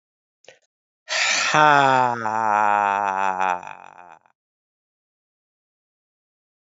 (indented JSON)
{
  "exhalation_length": "6.7 s",
  "exhalation_amplitude": 30982,
  "exhalation_signal_mean_std_ratio": 0.4,
  "survey_phase": "alpha (2021-03-01 to 2021-08-12)",
  "age": "45-64",
  "gender": "Female",
  "wearing_mask": "No",
  "symptom_cough_any": true,
  "symptom_fatigue": true,
  "symptom_fever_high_temperature": true,
  "symptom_headache": true,
  "symptom_change_to_sense_of_smell_or_taste": true,
  "symptom_loss_of_taste": true,
  "symptom_onset": "3 days",
  "smoker_status": "Never smoked",
  "respiratory_condition_asthma": false,
  "respiratory_condition_other": false,
  "recruitment_source": "Test and Trace",
  "submission_delay": "2 days",
  "covid_test_result": "Positive",
  "covid_test_method": "RT-qPCR"
}